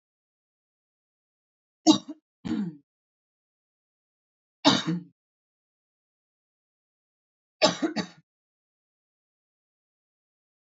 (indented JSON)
{
  "three_cough_length": "10.7 s",
  "three_cough_amplitude": 17204,
  "three_cough_signal_mean_std_ratio": 0.21,
  "survey_phase": "beta (2021-08-13 to 2022-03-07)",
  "age": "18-44",
  "gender": "Female",
  "wearing_mask": "No",
  "symptom_cough_any": true,
  "symptom_runny_or_blocked_nose": true,
  "symptom_fatigue": true,
  "symptom_headache": true,
  "symptom_onset": "5 days",
  "smoker_status": "Never smoked",
  "respiratory_condition_asthma": false,
  "respiratory_condition_other": false,
  "recruitment_source": "Test and Trace",
  "submission_delay": "1 day",
  "covid_test_result": "Positive",
  "covid_test_method": "ePCR"
}